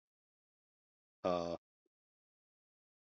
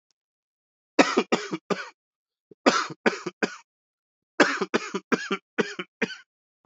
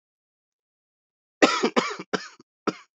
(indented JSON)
{
  "exhalation_length": "3.1 s",
  "exhalation_amplitude": 2391,
  "exhalation_signal_mean_std_ratio": 0.22,
  "three_cough_length": "6.7 s",
  "three_cough_amplitude": 25704,
  "three_cough_signal_mean_std_ratio": 0.34,
  "cough_length": "3.0 s",
  "cough_amplitude": 25463,
  "cough_signal_mean_std_ratio": 0.3,
  "survey_phase": "beta (2021-08-13 to 2022-03-07)",
  "age": "45-64",
  "gender": "Male",
  "wearing_mask": "No",
  "symptom_cough_any": true,
  "symptom_new_continuous_cough": true,
  "symptom_runny_or_blocked_nose": true,
  "symptom_shortness_of_breath": true,
  "symptom_sore_throat": true,
  "symptom_abdominal_pain": true,
  "symptom_diarrhoea": true,
  "symptom_fatigue": true,
  "symptom_fever_high_temperature": true,
  "symptom_headache": true,
  "symptom_change_to_sense_of_smell_or_taste": true,
  "symptom_loss_of_taste": true,
  "symptom_other": true,
  "symptom_onset": "4 days",
  "smoker_status": "Never smoked",
  "respiratory_condition_asthma": false,
  "respiratory_condition_other": false,
  "recruitment_source": "Test and Trace",
  "submission_delay": "1 day",
  "covid_test_result": "Positive",
  "covid_test_method": "RT-qPCR",
  "covid_ct_value": 16.7,
  "covid_ct_gene": "ORF1ab gene",
  "covid_ct_mean": 17.3,
  "covid_viral_load": "2200000 copies/ml",
  "covid_viral_load_category": "High viral load (>1M copies/ml)"
}